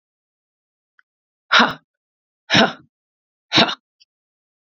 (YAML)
exhalation_length: 4.7 s
exhalation_amplitude: 31051
exhalation_signal_mean_std_ratio: 0.26
survey_phase: beta (2021-08-13 to 2022-03-07)
age: 18-44
gender: Female
wearing_mask: 'No'
symptom_cough_any: true
symptom_shortness_of_breath: true
symptom_sore_throat: true
symptom_fatigue: true
symptom_headache: true
smoker_status: Never smoked
respiratory_condition_asthma: false
respiratory_condition_other: false
recruitment_source: Test and Trace
submission_delay: 2 days
covid_test_result: Positive
covid_test_method: LFT